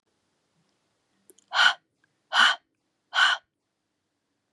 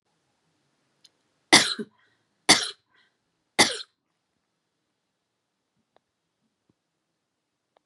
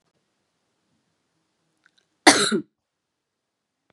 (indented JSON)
{
  "exhalation_length": "4.5 s",
  "exhalation_amplitude": 17470,
  "exhalation_signal_mean_std_ratio": 0.29,
  "three_cough_length": "7.9 s",
  "three_cough_amplitude": 31821,
  "three_cough_signal_mean_std_ratio": 0.18,
  "cough_length": "3.9 s",
  "cough_amplitude": 32767,
  "cough_signal_mean_std_ratio": 0.19,
  "survey_phase": "beta (2021-08-13 to 2022-03-07)",
  "age": "18-44",
  "gender": "Female",
  "wearing_mask": "No",
  "symptom_cough_any": true,
  "symptom_sore_throat": true,
  "symptom_fatigue": true,
  "symptom_change_to_sense_of_smell_or_taste": true,
  "symptom_loss_of_taste": true,
  "symptom_onset": "3 days",
  "smoker_status": "Ex-smoker",
  "respiratory_condition_asthma": false,
  "respiratory_condition_other": false,
  "recruitment_source": "Test and Trace",
  "submission_delay": "2 days",
  "covid_test_result": "Positive",
  "covid_test_method": "RT-qPCR",
  "covid_ct_value": 18.1,
  "covid_ct_gene": "ORF1ab gene",
  "covid_ct_mean": 18.6,
  "covid_viral_load": "790000 copies/ml",
  "covid_viral_load_category": "Low viral load (10K-1M copies/ml)"
}